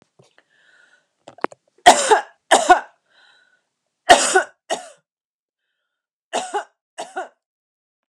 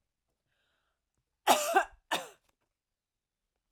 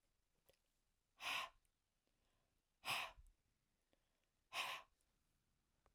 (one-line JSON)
{"three_cough_length": "8.1 s", "three_cough_amplitude": 32768, "three_cough_signal_mean_std_ratio": 0.27, "cough_length": "3.7 s", "cough_amplitude": 10641, "cough_signal_mean_std_ratio": 0.25, "exhalation_length": "5.9 s", "exhalation_amplitude": 821, "exhalation_signal_mean_std_ratio": 0.31, "survey_phase": "alpha (2021-03-01 to 2021-08-12)", "age": "45-64", "gender": "Female", "wearing_mask": "No", "symptom_none": true, "smoker_status": "Never smoked", "respiratory_condition_asthma": false, "respiratory_condition_other": false, "recruitment_source": "REACT", "submission_delay": "1 day", "covid_test_result": "Negative", "covid_test_method": "RT-qPCR"}